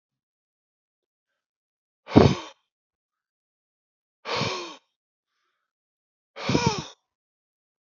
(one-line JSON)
{"exhalation_length": "7.9 s", "exhalation_amplitude": 27880, "exhalation_signal_mean_std_ratio": 0.22, "survey_phase": "alpha (2021-03-01 to 2021-08-12)", "age": "65+", "gender": "Male", "wearing_mask": "No", "symptom_none": true, "smoker_status": "Never smoked", "respiratory_condition_asthma": false, "respiratory_condition_other": false, "recruitment_source": "REACT", "submission_delay": "1 day", "covid_test_result": "Negative", "covid_test_method": "RT-qPCR"}